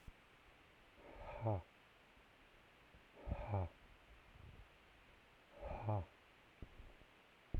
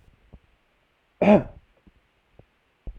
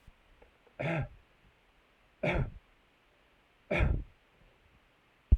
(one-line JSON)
{"exhalation_length": "7.6 s", "exhalation_amplitude": 1129, "exhalation_signal_mean_std_ratio": 0.45, "cough_length": "3.0 s", "cough_amplitude": 22595, "cough_signal_mean_std_ratio": 0.22, "three_cough_length": "5.4 s", "three_cough_amplitude": 10014, "three_cough_signal_mean_std_ratio": 0.31, "survey_phase": "alpha (2021-03-01 to 2021-08-12)", "age": "45-64", "gender": "Male", "wearing_mask": "No", "symptom_none": true, "smoker_status": "Ex-smoker", "respiratory_condition_asthma": false, "respiratory_condition_other": false, "recruitment_source": "REACT", "submission_delay": "2 days", "covid_test_result": "Negative", "covid_test_method": "RT-qPCR"}